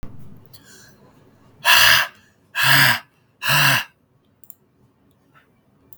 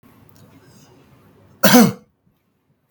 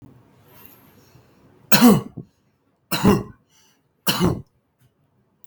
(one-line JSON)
{"exhalation_length": "6.0 s", "exhalation_amplitude": 32768, "exhalation_signal_mean_std_ratio": 0.39, "cough_length": "2.9 s", "cough_amplitude": 32768, "cough_signal_mean_std_ratio": 0.27, "three_cough_length": "5.5 s", "three_cough_amplitude": 32766, "three_cough_signal_mean_std_ratio": 0.31, "survey_phase": "beta (2021-08-13 to 2022-03-07)", "age": "18-44", "gender": "Male", "wearing_mask": "No", "symptom_fatigue": true, "symptom_onset": "8 days", "smoker_status": "Never smoked", "respiratory_condition_asthma": false, "respiratory_condition_other": false, "recruitment_source": "REACT", "submission_delay": "2 days", "covid_test_result": "Negative", "covid_test_method": "RT-qPCR"}